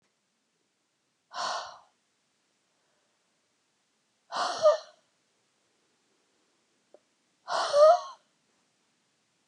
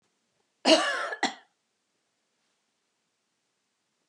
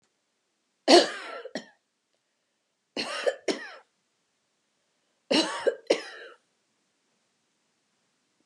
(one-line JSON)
{"exhalation_length": "9.5 s", "exhalation_amplitude": 12254, "exhalation_signal_mean_std_ratio": 0.25, "cough_length": "4.1 s", "cough_amplitude": 16451, "cough_signal_mean_std_ratio": 0.25, "three_cough_length": "8.5 s", "three_cough_amplitude": 25263, "three_cough_signal_mean_std_ratio": 0.26, "survey_phase": "beta (2021-08-13 to 2022-03-07)", "age": "65+", "gender": "Female", "wearing_mask": "No", "symptom_none": true, "smoker_status": "Never smoked", "respiratory_condition_asthma": false, "respiratory_condition_other": false, "recruitment_source": "Test and Trace", "submission_delay": "-1 day", "covid_test_result": "Negative", "covid_test_method": "RT-qPCR"}